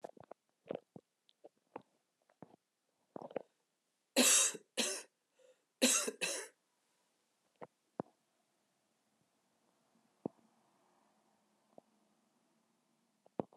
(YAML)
cough_length: 13.6 s
cough_amplitude: 5523
cough_signal_mean_std_ratio: 0.23
survey_phase: alpha (2021-03-01 to 2021-08-12)
age: 45-64
gender: Female
wearing_mask: 'No'
symptom_new_continuous_cough: true
symptom_fatigue: true
symptom_fever_high_temperature: true
symptom_change_to_sense_of_smell_or_taste: true
symptom_onset: 2 days
smoker_status: Current smoker (e-cigarettes or vapes only)
respiratory_condition_asthma: true
respiratory_condition_other: false
recruitment_source: Test and Trace
submission_delay: 1 day
covid_test_result: Positive
covid_test_method: RT-qPCR
covid_ct_value: 16.7
covid_ct_gene: ORF1ab gene
covid_ct_mean: 17.6
covid_viral_load: 1700000 copies/ml
covid_viral_load_category: High viral load (>1M copies/ml)